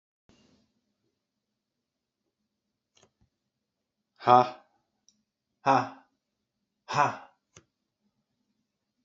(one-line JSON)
{"exhalation_length": "9.0 s", "exhalation_amplitude": 20629, "exhalation_signal_mean_std_ratio": 0.18, "survey_phase": "beta (2021-08-13 to 2022-03-07)", "age": "45-64", "gender": "Male", "wearing_mask": "No", "symptom_cough_any": true, "symptom_sore_throat": true, "symptom_fatigue": true, "symptom_fever_high_temperature": true, "symptom_headache": true, "symptom_onset": "3 days", "smoker_status": "Never smoked", "respiratory_condition_asthma": false, "respiratory_condition_other": false, "recruitment_source": "Test and Trace", "submission_delay": "2 days", "covid_test_result": "Positive", "covid_test_method": "RT-qPCR", "covid_ct_value": 16.8, "covid_ct_gene": "ORF1ab gene", "covid_ct_mean": 18.0, "covid_viral_load": "1300000 copies/ml", "covid_viral_load_category": "High viral load (>1M copies/ml)"}